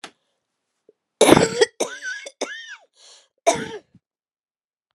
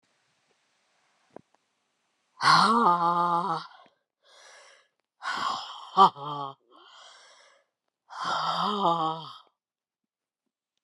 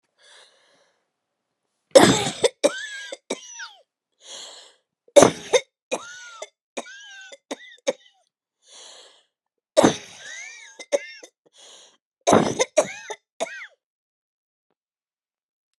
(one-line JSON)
{"cough_length": "4.9 s", "cough_amplitude": 32768, "cough_signal_mean_std_ratio": 0.29, "exhalation_length": "10.8 s", "exhalation_amplitude": 17924, "exhalation_signal_mean_std_ratio": 0.39, "three_cough_length": "15.8 s", "three_cough_amplitude": 32768, "three_cough_signal_mean_std_ratio": 0.26, "survey_phase": "beta (2021-08-13 to 2022-03-07)", "age": "45-64", "gender": "Female", "wearing_mask": "No", "symptom_cough_any": true, "symptom_new_continuous_cough": true, "symptom_runny_or_blocked_nose": true, "symptom_shortness_of_breath": true, "symptom_sore_throat": true, "symptom_fatigue": true, "symptom_fever_high_temperature": true, "symptom_headache": true, "symptom_onset": "2 days", "smoker_status": "Ex-smoker", "respiratory_condition_asthma": false, "respiratory_condition_other": false, "recruitment_source": "Test and Trace", "submission_delay": "2 days", "covid_test_result": "Positive", "covid_test_method": "RT-qPCR"}